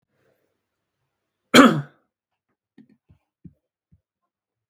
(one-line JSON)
{"cough_length": "4.7 s", "cough_amplitude": 32768, "cough_signal_mean_std_ratio": 0.17, "survey_phase": "beta (2021-08-13 to 2022-03-07)", "age": "18-44", "gender": "Male", "wearing_mask": "No", "symptom_fatigue": true, "smoker_status": "Never smoked", "respiratory_condition_asthma": false, "respiratory_condition_other": false, "recruitment_source": "Test and Trace", "submission_delay": "1 day", "covid_test_result": "Positive", "covid_test_method": "RT-qPCR", "covid_ct_value": 34.1, "covid_ct_gene": "ORF1ab gene"}